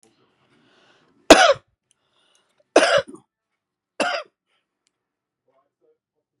{"three_cough_length": "6.4 s", "three_cough_amplitude": 32768, "three_cough_signal_mean_std_ratio": 0.22, "survey_phase": "beta (2021-08-13 to 2022-03-07)", "age": "45-64", "gender": "Female", "wearing_mask": "No", "symptom_headache": true, "smoker_status": "Current smoker (11 or more cigarettes per day)", "respiratory_condition_asthma": false, "respiratory_condition_other": false, "recruitment_source": "REACT", "submission_delay": "2 days", "covid_test_result": "Negative", "covid_test_method": "RT-qPCR", "influenza_a_test_result": "Unknown/Void", "influenza_b_test_result": "Unknown/Void"}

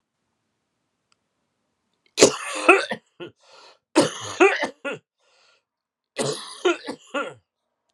{"three_cough_length": "7.9 s", "three_cough_amplitude": 32768, "three_cough_signal_mean_std_ratio": 0.31, "survey_phase": "alpha (2021-03-01 to 2021-08-12)", "age": "45-64", "gender": "Male", "wearing_mask": "No", "symptom_cough_any": true, "symptom_new_continuous_cough": true, "symptom_shortness_of_breath": true, "symptom_fatigue": true, "symptom_fever_high_temperature": true, "symptom_onset": "4 days", "smoker_status": "Ex-smoker", "respiratory_condition_asthma": false, "respiratory_condition_other": false, "recruitment_source": "Test and Trace", "submission_delay": "1 day", "covid_ct_value": 28.0, "covid_ct_gene": "ORF1ab gene"}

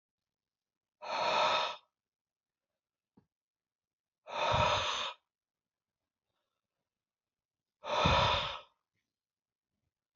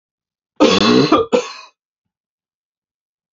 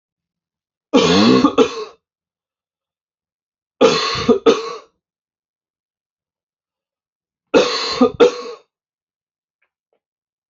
{"exhalation_length": "10.2 s", "exhalation_amplitude": 6530, "exhalation_signal_mean_std_ratio": 0.37, "cough_length": "3.3 s", "cough_amplitude": 29152, "cough_signal_mean_std_ratio": 0.39, "three_cough_length": "10.5 s", "three_cough_amplitude": 30635, "three_cough_signal_mean_std_ratio": 0.35, "survey_phase": "alpha (2021-03-01 to 2021-08-12)", "age": "18-44", "gender": "Male", "wearing_mask": "No", "symptom_none": true, "smoker_status": "Ex-smoker", "respiratory_condition_asthma": false, "respiratory_condition_other": false, "recruitment_source": "REACT", "submission_delay": "1 day", "covid_test_result": "Negative", "covid_test_method": "RT-qPCR"}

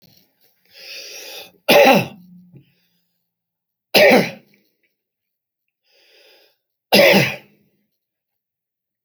{"three_cough_length": "9.0 s", "three_cough_amplitude": 32768, "three_cough_signal_mean_std_ratio": 0.3, "survey_phase": "alpha (2021-03-01 to 2021-08-12)", "age": "65+", "gender": "Male", "wearing_mask": "No", "symptom_cough_any": true, "smoker_status": "Never smoked", "respiratory_condition_asthma": false, "respiratory_condition_other": true, "recruitment_source": "REACT", "submission_delay": "3 days", "covid_test_result": "Negative", "covid_test_method": "RT-qPCR"}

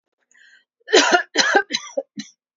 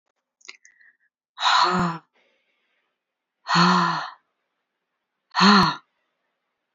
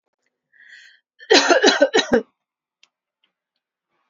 {"cough_length": "2.6 s", "cough_amplitude": 29012, "cough_signal_mean_std_ratio": 0.41, "exhalation_length": "6.7 s", "exhalation_amplitude": 21885, "exhalation_signal_mean_std_ratio": 0.38, "three_cough_length": "4.1 s", "three_cough_amplitude": 29578, "three_cough_signal_mean_std_ratio": 0.34, "survey_phase": "alpha (2021-03-01 to 2021-08-12)", "age": "45-64", "gender": "Female", "wearing_mask": "No", "symptom_none": true, "smoker_status": "Ex-smoker", "respiratory_condition_asthma": false, "respiratory_condition_other": false, "recruitment_source": "REACT", "submission_delay": "2 days", "covid_test_result": "Negative", "covid_test_method": "RT-qPCR"}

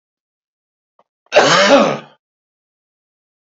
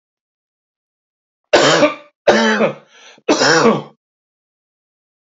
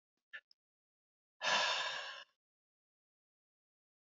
{"cough_length": "3.6 s", "cough_amplitude": 30547, "cough_signal_mean_std_ratio": 0.34, "three_cough_length": "5.3 s", "three_cough_amplitude": 32768, "three_cough_signal_mean_std_ratio": 0.42, "exhalation_length": "4.0 s", "exhalation_amplitude": 3092, "exhalation_signal_mean_std_ratio": 0.33, "survey_phase": "alpha (2021-03-01 to 2021-08-12)", "age": "45-64", "gender": "Male", "wearing_mask": "No", "symptom_none": true, "smoker_status": "Never smoked", "respiratory_condition_asthma": false, "respiratory_condition_other": false, "recruitment_source": "REACT", "submission_delay": "1 day", "covid_test_result": "Negative", "covid_test_method": "RT-qPCR"}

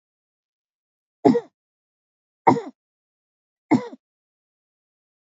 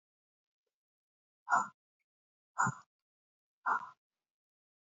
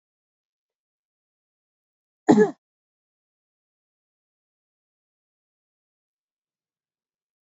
{"three_cough_length": "5.4 s", "three_cough_amplitude": 29364, "three_cough_signal_mean_std_ratio": 0.2, "exhalation_length": "4.9 s", "exhalation_amplitude": 4951, "exhalation_signal_mean_std_ratio": 0.24, "cough_length": "7.6 s", "cough_amplitude": 26141, "cough_signal_mean_std_ratio": 0.12, "survey_phase": "beta (2021-08-13 to 2022-03-07)", "age": "65+", "gender": "Female", "wearing_mask": "No", "symptom_none": true, "smoker_status": "Never smoked", "respiratory_condition_asthma": false, "respiratory_condition_other": false, "recruitment_source": "REACT", "submission_delay": "2 days", "covid_test_result": "Negative", "covid_test_method": "RT-qPCR", "influenza_a_test_result": "Negative", "influenza_b_test_result": "Negative"}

